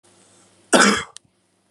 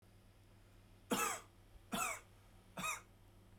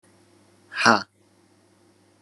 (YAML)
cough_length: 1.7 s
cough_amplitude: 31564
cough_signal_mean_std_ratio: 0.33
three_cough_length: 3.6 s
three_cough_amplitude: 2333
three_cough_signal_mean_std_ratio: 0.47
exhalation_length: 2.2 s
exhalation_amplitude: 31139
exhalation_signal_mean_std_ratio: 0.23
survey_phase: alpha (2021-03-01 to 2021-08-12)
age: 18-44
gender: Male
wearing_mask: 'No'
symptom_headache: true
smoker_status: Never smoked
respiratory_condition_asthma: true
respiratory_condition_other: false
recruitment_source: Test and Trace
submission_delay: 0 days
covid_test_result: Positive
covid_test_method: RT-qPCR